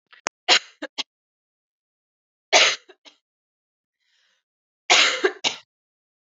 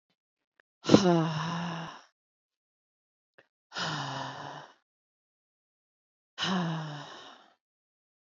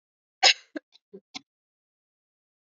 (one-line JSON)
{"three_cough_length": "6.2 s", "three_cough_amplitude": 30037, "three_cough_signal_mean_std_ratio": 0.27, "exhalation_length": "8.4 s", "exhalation_amplitude": 24720, "exhalation_signal_mean_std_ratio": 0.34, "cough_length": "2.7 s", "cough_amplitude": 19660, "cough_signal_mean_std_ratio": 0.16, "survey_phase": "beta (2021-08-13 to 2022-03-07)", "age": "18-44", "gender": "Female", "wearing_mask": "No", "symptom_none": true, "symptom_onset": "3 days", "smoker_status": "Never smoked", "respiratory_condition_asthma": false, "respiratory_condition_other": false, "recruitment_source": "REACT", "submission_delay": "1 day", "covid_test_result": "Negative", "covid_test_method": "RT-qPCR", "influenza_a_test_result": "Unknown/Void", "influenza_b_test_result": "Unknown/Void"}